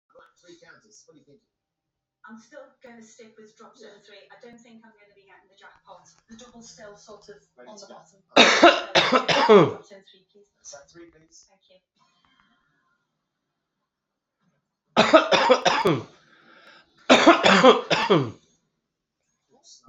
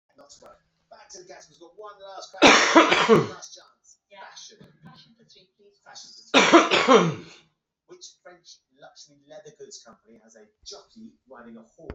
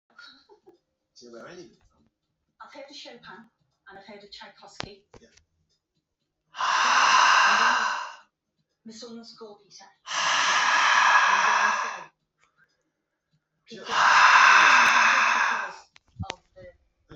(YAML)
three_cough_length: 19.9 s
three_cough_amplitude: 32767
three_cough_signal_mean_std_ratio: 0.31
cough_length: 11.9 s
cough_amplitude: 32767
cough_signal_mean_std_ratio: 0.31
exhalation_length: 17.2 s
exhalation_amplitude: 21448
exhalation_signal_mean_std_ratio: 0.47
survey_phase: beta (2021-08-13 to 2022-03-07)
age: 45-64
gender: Male
wearing_mask: 'No'
symptom_cough_any: true
symptom_change_to_sense_of_smell_or_taste: true
smoker_status: Current smoker (1 to 10 cigarettes per day)
respiratory_condition_asthma: false
respiratory_condition_other: false
recruitment_source: Test and Trace
submission_delay: 2 days
covid_test_result: Positive
covid_test_method: RT-qPCR